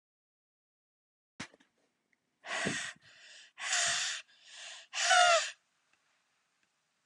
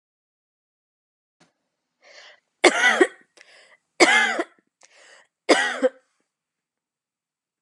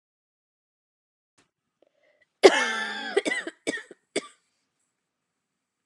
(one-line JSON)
{"exhalation_length": "7.1 s", "exhalation_amplitude": 8529, "exhalation_signal_mean_std_ratio": 0.36, "three_cough_length": "7.6 s", "three_cough_amplitude": 32680, "three_cough_signal_mean_std_ratio": 0.29, "cough_length": "5.9 s", "cough_amplitude": 32180, "cough_signal_mean_std_ratio": 0.24, "survey_phase": "beta (2021-08-13 to 2022-03-07)", "age": "18-44", "gender": "Female", "wearing_mask": "No", "symptom_cough_any": true, "symptom_runny_or_blocked_nose": true, "symptom_fatigue": true, "symptom_headache": true, "symptom_change_to_sense_of_smell_or_taste": true, "symptom_onset": "4 days", "smoker_status": "Never smoked", "respiratory_condition_asthma": false, "respiratory_condition_other": false, "recruitment_source": "Test and Trace", "submission_delay": "2 days", "covid_test_result": "Positive", "covid_test_method": "RT-qPCR"}